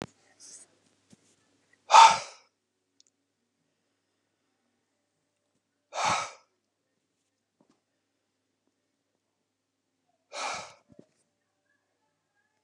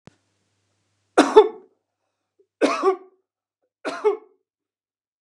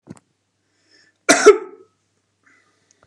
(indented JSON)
{
  "exhalation_length": "12.6 s",
  "exhalation_amplitude": 23318,
  "exhalation_signal_mean_std_ratio": 0.15,
  "three_cough_length": "5.2 s",
  "three_cough_amplitude": 32735,
  "three_cough_signal_mean_std_ratio": 0.26,
  "cough_length": "3.1 s",
  "cough_amplitude": 32768,
  "cough_signal_mean_std_ratio": 0.22,
  "survey_phase": "beta (2021-08-13 to 2022-03-07)",
  "age": "45-64",
  "gender": "Male",
  "wearing_mask": "No",
  "symptom_none": true,
  "smoker_status": "Never smoked",
  "respiratory_condition_asthma": false,
  "respiratory_condition_other": false,
  "recruitment_source": "REACT",
  "submission_delay": "1 day",
  "covid_test_result": "Negative",
  "covid_test_method": "RT-qPCR",
  "influenza_a_test_result": "Unknown/Void",
  "influenza_b_test_result": "Unknown/Void"
}